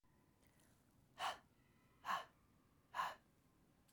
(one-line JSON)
{"exhalation_length": "3.9 s", "exhalation_amplitude": 983, "exhalation_signal_mean_std_ratio": 0.35, "survey_phase": "beta (2021-08-13 to 2022-03-07)", "age": "18-44", "gender": "Female", "wearing_mask": "No", "symptom_none": true, "smoker_status": "Never smoked", "respiratory_condition_asthma": false, "respiratory_condition_other": false, "recruitment_source": "REACT", "submission_delay": "2 days", "covid_test_result": "Negative", "covid_test_method": "RT-qPCR"}